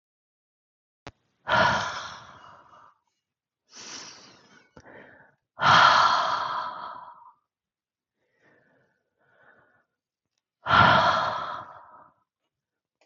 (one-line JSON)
{"exhalation_length": "13.1 s", "exhalation_amplitude": 21204, "exhalation_signal_mean_std_ratio": 0.35, "survey_phase": "beta (2021-08-13 to 2022-03-07)", "age": "45-64", "gender": "Female", "wearing_mask": "No", "symptom_cough_any": true, "symptom_new_continuous_cough": true, "symptom_fatigue": true, "symptom_change_to_sense_of_smell_or_taste": true, "symptom_other": true, "symptom_onset": "9 days", "smoker_status": "Ex-smoker", "respiratory_condition_asthma": false, "respiratory_condition_other": false, "recruitment_source": "REACT", "submission_delay": "1 day", "covid_test_result": "Positive", "covid_test_method": "RT-qPCR", "covid_ct_value": 30.0, "covid_ct_gene": "E gene", "influenza_a_test_result": "Negative", "influenza_b_test_result": "Negative"}